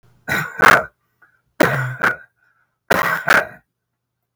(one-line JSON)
{"three_cough_length": "4.4 s", "three_cough_amplitude": 32768, "three_cough_signal_mean_std_ratio": 0.42, "survey_phase": "beta (2021-08-13 to 2022-03-07)", "age": "65+", "gender": "Male", "wearing_mask": "No", "symptom_none": true, "smoker_status": "Never smoked", "respiratory_condition_asthma": false, "respiratory_condition_other": false, "recruitment_source": "REACT", "submission_delay": "6 days", "covid_test_result": "Negative", "covid_test_method": "RT-qPCR", "influenza_a_test_result": "Negative", "influenza_b_test_result": "Negative"}